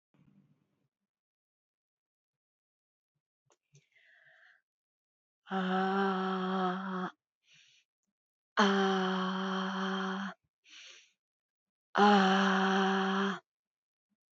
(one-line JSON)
{"exhalation_length": "14.3 s", "exhalation_amplitude": 7817, "exhalation_signal_mean_std_ratio": 0.48, "survey_phase": "beta (2021-08-13 to 2022-03-07)", "age": "45-64", "gender": "Female", "wearing_mask": "No", "symptom_none": true, "smoker_status": "Never smoked", "respiratory_condition_asthma": false, "respiratory_condition_other": false, "recruitment_source": "REACT", "submission_delay": "3 days", "covid_test_result": "Negative", "covid_test_method": "RT-qPCR", "influenza_a_test_result": "Negative", "influenza_b_test_result": "Negative"}